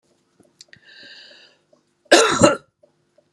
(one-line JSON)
{"cough_length": "3.3 s", "cough_amplitude": 32767, "cough_signal_mean_std_ratio": 0.28, "survey_phase": "beta (2021-08-13 to 2022-03-07)", "age": "45-64", "gender": "Female", "wearing_mask": "No", "symptom_cough_any": true, "symptom_runny_or_blocked_nose": true, "symptom_sore_throat": true, "symptom_diarrhoea": true, "symptom_fatigue": true, "symptom_fever_high_temperature": true, "symptom_headache": true, "symptom_change_to_sense_of_smell_or_taste": true, "symptom_onset": "4 days", "smoker_status": "Never smoked", "respiratory_condition_asthma": false, "respiratory_condition_other": false, "recruitment_source": "Test and Trace", "submission_delay": "2 days", "covid_test_result": "Positive", "covid_test_method": "RT-qPCR"}